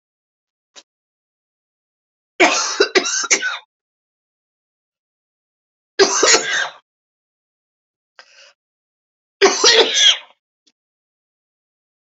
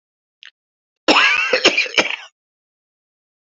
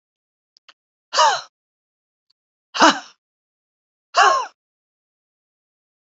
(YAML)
three_cough_length: 12.0 s
three_cough_amplitude: 32767
three_cough_signal_mean_std_ratio: 0.33
cough_length: 3.4 s
cough_amplitude: 32767
cough_signal_mean_std_ratio: 0.4
exhalation_length: 6.1 s
exhalation_amplitude: 28743
exhalation_signal_mean_std_ratio: 0.26
survey_phase: beta (2021-08-13 to 2022-03-07)
age: 45-64
gender: Female
wearing_mask: 'No'
symptom_cough_any: true
symptom_runny_or_blocked_nose: true
symptom_sore_throat: true
symptom_fatigue: true
symptom_headache: true
smoker_status: Ex-smoker
respiratory_condition_asthma: false
respiratory_condition_other: false
recruitment_source: Test and Trace
submission_delay: 1 day
covid_test_result: Positive
covid_test_method: RT-qPCR
covid_ct_value: 20.0
covid_ct_gene: ORF1ab gene